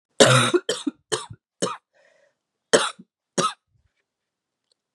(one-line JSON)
{"three_cough_length": "4.9 s", "three_cough_amplitude": 31545, "three_cough_signal_mean_std_ratio": 0.32, "survey_phase": "beta (2021-08-13 to 2022-03-07)", "age": "18-44", "gender": "Female", "wearing_mask": "No", "symptom_cough_any": true, "symptom_runny_or_blocked_nose": true, "symptom_shortness_of_breath": true, "symptom_sore_throat": true, "symptom_fatigue": true, "symptom_headache": true, "smoker_status": "Never smoked", "respiratory_condition_asthma": true, "respiratory_condition_other": false, "recruitment_source": "Test and Trace", "submission_delay": "2 days", "covid_test_result": "Positive", "covid_test_method": "ePCR"}